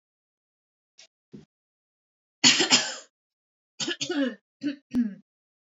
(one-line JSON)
{"cough_length": "5.7 s", "cough_amplitude": 20823, "cough_signal_mean_std_ratio": 0.33, "survey_phase": "alpha (2021-03-01 to 2021-08-12)", "age": "18-44", "gender": "Female", "wearing_mask": "No", "symptom_none": true, "smoker_status": "Never smoked", "respiratory_condition_asthma": true, "respiratory_condition_other": false, "recruitment_source": "REACT", "submission_delay": "2 days", "covid_test_result": "Negative", "covid_test_method": "RT-qPCR"}